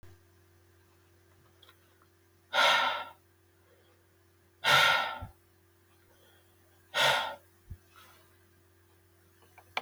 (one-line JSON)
{"exhalation_length": "9.8 s", "exhalation_amplitude": 9383, "exhalation_signal_mean_std_ratio": 0.32, "survey_phase": "beta (2021-08-13 to 2022-03-07)", "age": "65+", "gender": "Male", "wearing_mask": "No", "symptom_none": true, "smoker_status": "Never smoked", "respiratory_condition_asthma": false, "respiratory_condition_other": false, "recruitment_source": "REACT", "submission_delay": "3 days", "covid_test_result": "Negative", "covid_test_method": "RT-qPCR", "influenza_a_test_result": "Negative", "influenza_b_test_result": "Negative"}